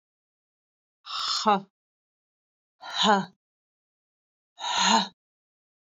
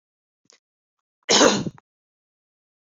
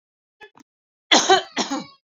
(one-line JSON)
{"exhalation_length": "6.0 s", "exhalation_amplitude": 14307, "exhalation_signal_mean_std_ratio": 0.34, "cough_length": "2.8 s", "cough_amplitude": 26231, "cough_signal_mean_std_ratio": 0.27, "three_cough_length": "2.0 s", "three_cough_amplitude": 29389, "three_cough_signal_mean_std_ratio": 0.35, "survey_phase": "beta (2021-08-13 to 2022-03-07)", "age": "18-44", "gender": "Female", "wearing_mask": "No", "symptom_none": true, "smoker_status": "Never smoked", "respiratory_condition_asthma": false, "respiratory_condition_other": false, "recruitment_source": "REACT", "submission_delay": "2 days", "covid_test_result": "Negative", "covid_test_method": "RT-qPCR"}